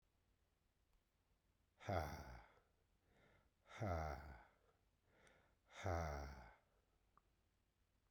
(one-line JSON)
{"exhalation_length": "8.1 s", "exhalation_amplitude": 1105, "exhalation_signal_mean_std_ratio": 0.37, "survey_phase": "beta (2021-08-13 to 2022-03-07)", "age": "45-64", "gender": "Male", "wearing_mask": "No", "symptom_none": true, "smoker_status": "Never smoked", "respiratory_condition_asthma": false, "respiratory_condition_other": false, "recruitment_source": "REACT", "submission_delay": "1 day", "covid_test_result": "Negative", "covid_test_method": "RT-qPCR"}